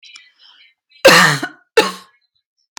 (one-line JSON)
{"cough_length": "2.8 s", "cough_amplitude": 32768, "cough_signal_mean_std_ratio": 0.34, "survey_phase": "beta (2021-08-13 to 2022-03-07)", "age": "45-64", "gender": "Female", "wearing_mask": "No", "symptom_none": true, "smoker_status": "Never smoked", "respiratory_condition_asthma": false, "respiratory_condition_other": false, "recruitment_source": "REACT", "submission_delay": "1 day", "covid_test_result": "Negative", "covid_test_method": "RT-qPCR"}